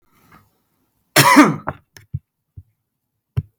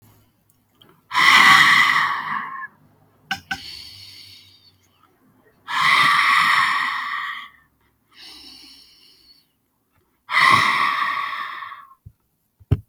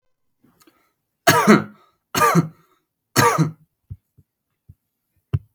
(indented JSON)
{
  "cough_length": "3.6 s",
  "cough_amplitude": 32768,
  "cough_signal_mean_std_ratio": 0.28,
  "exhalation_length": "12.9 s",
  "exhalation_amplitude": 32768,
  "exhalation_signal_mean_std_ratio": 0.47,
  "three_cough_length": "5.5 s",
  "three_cough_amplitude": 32768,
  "three_cough_signal_mean_std_ratio": 0.34,
  "survey_phase": "beta (2021-08-13 to 2022-03-07)",
  "age": "18-44",
  "gender": "Male",
  "wearing_mask": "No",
  "symptom_runny_or_blocked_nose": true,
  "smoker_status": "Never smoked",
  "respiratory_condition_asthma": false,
  "respiratory_condition_other": false,
  "recruitment_source": "REACT",
  "submission_delay": "1 day",
  "covid_test_result": "Negative",
  "covid_test_method": "RT-qPCR",
  "influenza_a_test_result": "Negative",
  "influenza_b_test_result": "Negative"
}